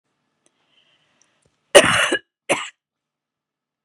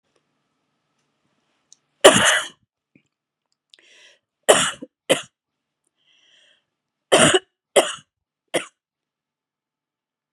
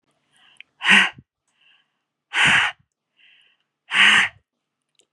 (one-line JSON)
{"cough_length": "3.8 s", "cough_amplitude": 32768, "cough_signal_mean_std_ratio": 0.25, "three_cough_length": "10.3 s", "three_cough_amplitude": 32768, "three_cough_signal_mean_std_ratio": 0.24, "exhalation_length": "5.1 s", "exhalation_amplitude": 31111, "exhalation_signal_mean_std_ratio": 0.35, "survey_phase": "beta (2021-08-13 to 2022-03-07)", "age": "45-64", "gender": "Female", "wearing_mask": "No", "symptom_none": true, "smoker_status": "Never smoked", "respiratory_condition_asthma": false, "respiratory_condition_other": false, "recruitment_source": "REACT", "submission_delay": "1 day", "covid_test_result": "Negative", "covid_test_method": "RT-qPCR", "influenza_a_test_result": "Negative", "influenza_b_test_result": "Negative"}